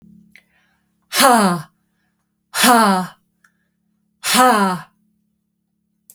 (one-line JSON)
{"exhalation_length": "6.1 s", "exhalation_amplitude": 32768, "exhalation_signal_mean_std_ratio": 0.41, "survey_phase": "beta (2021-08-13 to 2022-03-07)", "age": "45-64", "gender": "Female", "wearing_mask": "No", "symptom_runny_or_blocked_nose": true, "smoker_status": "Ex-smoker", "respiratory_condition_asthma": false, "respiratory_condition_other": false, "recruitment_source": "REACT", "submission_delay": "1 day", "covid_test_result": "Negative", "covid_test_method": "RT-qPCR"}